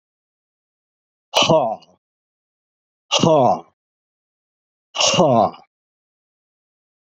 {"exhalation_length": "7.1 s", "exhalation_amplitude": 29288, "exhalation_signal_mean_std_ratio": 0.35, "survey_phase": "beta (2021-08-13 to 2022-03-07)", "age": "65+", "gender": "Male", "wearing_mask": "No", "symptom_none": true, "smoker_status": "Ex-smoker", "respiratory_condition_asthma": false, "respiratory_condition_other": false, "recruitment_source": "REACT", "submission_delay": "1 day", "covid_test_result": "Negative", "covid_test_method": "RT-qPCR", "influenza_a_test_result": "Unknown/Void", "influenza_b_test_result": "Unknown/Void"}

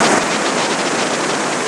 {"cough_length": "1.7 s", "cough_amplitude": 26027, "cough_signal_mean_std_ratio": 1.2, "survey_phase": "beta (2021-08-13 to 2022-03-07)", "age": "65+", "gender": "Female", "wearing_mask": "No", "symptom_cough_any": true, "symptom_runny_or_blocked_nose": true, "symptom_shortness_of_breath": true, "symptom_fatigue": true, "symptom_fever_high_temperature": true, "symptom_headache": true, "symptom_onset": "6 days", "smoker_status": "Never smoked", "respiratory_condition_asthma": false, "respiratory_condition_other": false, "recruitment_source": "Test and Trace", "submission_delay": "2 days", "covid_test_result": "Positive", "covid_test_method": "RT-qPCR", "covid_ct_value": 18.0, "covid_ct_gene": "ORF1ab gene"}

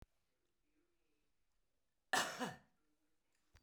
{"cough_length": "3.6 s", "cough_amplitude": 2432, "cough_signal_mean_std_ratio": 0.24, "survey_phase": "beta (2021-08-13 to 2022-03-07)", "age": "65+", "gender": "Female", "wearing_mask": "No", "symptom_cough_any": true, "symptom_onset": "12 days", "smoker_status": "Current smoker (1 to 10 cigarettes per day)", "respiratory_condition_asthma": false, "respiratory_condition_other": false, "recruitment_source": "REACT", "submission_delay": "3 days", "covid_test_result": "Negative", "covid_test_method": "RT-qPCR"}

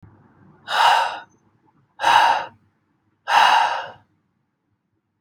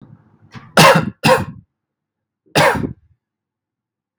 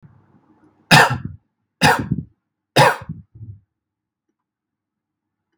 {"exhalation_length": "5.2 s", "exhalation_amplitude": 31971, "exhalation_signal_mean_std_ratio": 0.43, "cough_length": "4.2 s", "cough_amplitude": 32768, "cough_signal_mean_std_ratio": 0.36, "three_cough_length": "5.6 s", "three_cough_amplitude": 32768, "three_cough_signal_mean_std_ratio": 0.29, "survey_phase": "beta (2021-08-13 to 2022-03-07)", "age": "18-44", "gender": "Male", "wearing_mask": "No", "symptom_none": true, "smoker_status": "Current smoker (1 to 10 cigarettes per day)", "respiratory_condition_asthma": false, "respiratory_condition_other": false, "recruitment_source": "REACT", "submission_delay": "1 day", "covid_test_result": "Negative", "covid_test_method": "RT-qPCR", "influenza_a_test_result": "Negative", "influenza_b_test_result": "Negative"}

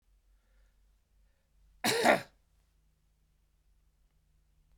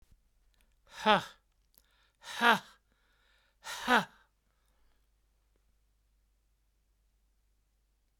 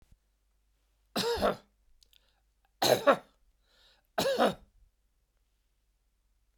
{"cough_length": "4.8 s", "cough_amplitude": 11250, "cough_signal_mean_std_ratio": 0.22, "exhalation_length": "8.2 s", "exhalation_amplitude": 11486, "exhalation_signal_mean_std_ratio": 0.21, "three_cough_length": "6.6 s", "three_cough_amplitude": 10743, "three_cough_signal_mean_std_ratio": 0.31, "survey_phase": "beta (2021-08-13 to 2022-03-07)", "age": "65+", "gender": "Male", "wearing_mask": "No", "symptom_none": true, "symptom_onset": "13 days", "smoker_status": "Ex-smoker", "respiratory_condition_asthma": false, "respiratory_condition_other": false, "recruitment_source": "REACT", "submission_delay": "3 days", "covid_test_result": "Negative", "covid_test_method": "RT-qPCR"}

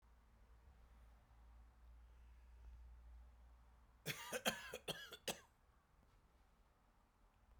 {"cough_length": "7.6 s", "cough_amplitude": 2148, "cough_signal_mean_std_ratio": 0.43, "survey_phase": "beta (2021-08-13 to 2022-03-07)", "age": "45-64", "gender": "Female", "wearing_mask": "No", "symptom_fatigue": true, "smoker_status": "Current smoker (11 or more cigarettes per day)", "respiratory_condition_asthma": false, "respiratory_condition_other": false, "recruitment_source": "REACT", "submission_delay": "1 day", "covid_test_result": "Negative", "covid_test_method": "RT-qPCR"}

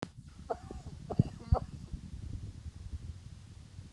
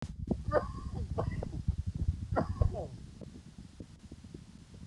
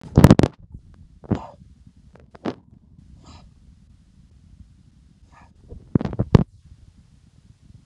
{"three_cough_length": "3.9 s", "three_cough_amplitude": 7878, "three_cough_signal_mean_std_ratio": 0.43, "cough_length": "4.9 s", "cough_amplitude": 6057, "cough_signal_mean_std_ratio": 0.61, "exhalation_length": "7.9 s", "exhalation_amplitude": 32768, "exhalation_signal_mean_std_ratio": 0.2, "survey_phase": "alpha (2021-03-01 to 2021-08-12)", "age": "45-64", "gender": "Male", "wearing_mask": "No", "symptom_cough_any": true, "symptom_fatigue": true, "symptom_onset": "9 days", "smoker_status": "Ex-smoker", "respiratory_condition_asthma": true, "respiratory_condition_other": false, "recruitment_source": "Test and Trace", "submission_delay": "1 day", "covid_test_result": "Positive", "covid_test_method": "RT-qPCR", "covid_ct_value": 27.8, "covid_ct_gene": "ORF1ab gene", "covid_ct_mean": 28.2, "covid_viral_load": "570 copies/ml", "covid_viral_load_category": "Minimal viral load (< 10K copies/ml)"}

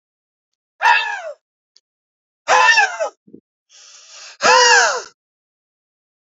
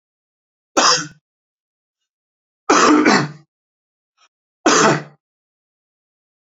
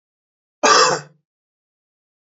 {"exhalation_length": "6.2 s", "exhalation_amplitude": 32768, "exhalation_signal_mean_std_ratio": 0.4, "three_cough_length": "6.6 s", "three_cough_amplitude": 32767, "three_cough_signal_mean_std_ratio": 0.35, "cough_length": "2.2 s", "cough_amplitude": 27738, "cough_signal_mean_std_ratio": 0.32, "survey_phase": "beta (2021-08-13 to 2022-03-07)", "age": "18-44", "gender": "Male", "wearing_mask": "No", "symptom_cough_any": true, "symptom_runny_or_blocked_nose": true, "symptom_sore_throat": true, "symptom_abdominal_pain": true, "symptom_fatigue": true, "symptom_fever_high_temperature": true, "symptom_headache": true, "symptom_change_to_sense_of_smell_or_taste": true, "symptom_onset": "5 days", "smoker_status": "Never smoked", "respiratory_condition_asthma": false, "respiratory_condition_other": false, "recruitment_source": "Test and Trace", "submission_delay": "2 days", "covid_test_result": "Positive", "covid_test_method": "RT-qPCR", "covid_ct_value": 23.7, "covid_ct_gene": "ORF1ab gene"}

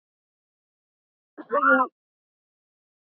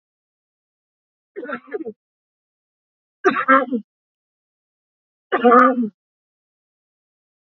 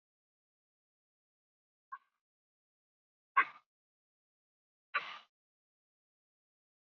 {"cough_length": "3.1 s", "cough_amplitude": 15377, "cough_signal_mean_std_ratio": 0.27, "three_cough_length": "7.6 s", "three_cough_amplitude": 32768, "three_cough_signal_mean_std_ratio": 0.28, "exhalation_length": "7.0 s", "exhalation_amplitude": 5260, "exhalation_signal_mean_std_ratio": 0.12, "survey_phase": "beta (2021-08-13 to 2022-03-07)", "age": "18-44", "gender": "Female", "wearing_mask": "No", "symptom_cough_any": true, "symptom_runny_or_blocked_nose": true, "symptom_shortness_of_breath": true, "symptom_sore_throat": true, "symptom_fever_high_temperature": true, "symptom_headache": true, "symptom_change_to_sense_of_smell_or_taste": true, "symptom_onset": "3 days", "smoker_status": "Ex-smoker", "respiratory_condition_asthma": false, "respiratory_condition_other": false, "recruitment_source": "Test and Trace", "submission_delay": "1 day", "covid_test_result": "Positive", "covid_test_method": "RT-qPCR", "covid_ct_value": 14.9, "covid_ct_gene": "ORF1ab gene", "covid_ct_mean": 15.1, "covid_viral_load": "11000000 copies/ml", "covid_viral_load_category": "High viral load (>1M copies/ml)"}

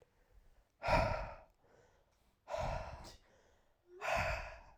{"exhalation_length": "4.8 s", "exhalation_amplitude": 3324, "exhalation_signal_mean_std_ratio": 0.45, "survey_phase": "alpha (2021-03-01 to 2021-08-12)", "age": "18-44", "gender": "Male", "wearing_mask": "No", "symptom_cough_any": true, "symptom_change_to_sense_of_smell_or_taste": true, "symptom_onset": "3 days", "smoker_status": "Never smoked", "respiratory_condition_asthma": false, "respiratory_condition_other": false, "recruitment_source": "Test and Trace", "submission_delay": "1 day", "covid_test_result": "Positive", "covid_test_method": "RT-qPCR"}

